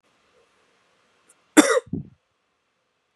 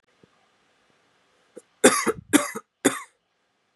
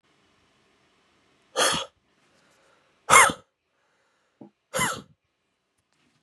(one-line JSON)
{"cough_length": "3.2 s", "cough_amplitude": 31919, "cough_signal_mean_std_ratio": 0.2, "three_cough_length": "3.8 s", "three_cough_amplitude": 31269, "three_cough_signal_mean_std_ratio": 0.26, "exhalation_length": "6.2 s", "exhalation_amplitude": 27603, "exhalation_signal_mean_std_ratio": 0.24, "survey_phase": "beta (2021-08-13 to 2022-03-07)", "age": "18-44", "gender": "Male", "wearing_mask": "No", "symptom_cough_any": true, "symptom_new_continuous_cough": true, "symptom_runny_or_blocked_nose": true, "symptom_shortness_of_breath": true, "symptom_sore_throat": true, "symptom_fatigue": true, "symptom_headache": true, "symptom_onset": "3 days", "smoker_status": "Never smoked", "respiratory_condition_asthma": true, "respiratory_condition_other": false, "recruitment_source": "Test and Trace", "submission_delay": "2 days", "covid_test_result": "Positive", "covid_test_method": "RT-qPCR", "covid_ct_value": 17.7, "covid_ct_gene": "N gene"}